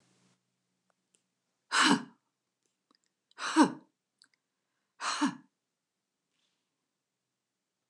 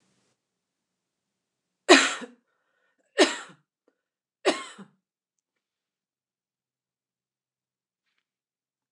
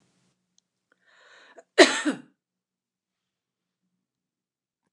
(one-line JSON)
{"exhalation_length": "7.9 s", "exhalation_amplitude": 10052, "exhalation_signal_mean_std_ratio": 0.24, "three_cough_length": "8.9 s", "three_cough_amplitude": 28027, "three_cough_signal_mean_std_ratio": 0.17, "cough_length": "4.9 s", "cough_amplitude": 28278, "cough_signal_mean_std_ratio": 0.16, "survey_phase": "beta (2021-08-13 to 2022-03-07)", "age": "45-64", "gender": "Female", "wearing_mask": "No", "symptom_headache": true, "smoker_status": "Never smoked", "respiratory_condition_asthma": true, "respiratory_condition_other": false, "recruitment_source": "REACT", "submission_delay": "1 day", "covid_test_result": "Negative", "covid_test_method": "RT-qPCR"}